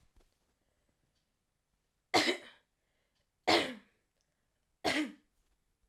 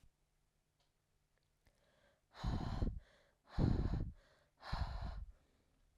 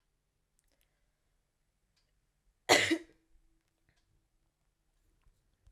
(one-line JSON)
{"three_cough_length": "5.9 s", "three_cough_amplitude": 7443, "three_cough_signal_mean_std_ratio": 0.27, "exhalation_length": "6.0 s", "exhalation_amplitude": 2268, "exhalation_signal_mean_std_ratio": 0.43, "cough_length": "5.7 s", "cough_amplitude": 10520, "cough_signal_mean_std_ratio": 0.17, "survey_phase": "alpha (2021-03-01 to 2021-08-12)", "age": "18-44", "gender": "Female", "wearing_mask": "No", "symptom_shortness_of_breath": true, "symptom_diarrhoea": true, "symptom_fatigue": true, "symptom_headache": true, "symptom_change_to_sense_of_smell_or_taste": true, "smoker_status": "Never smoked", "respiratory_condition_asthma": false, "respiratory_condition_other": false, "recruitment_source": "Test and Trace", "submission_delay": "2 days", "covid_test_result": "Positive", "covid_test_method": "ePCR"}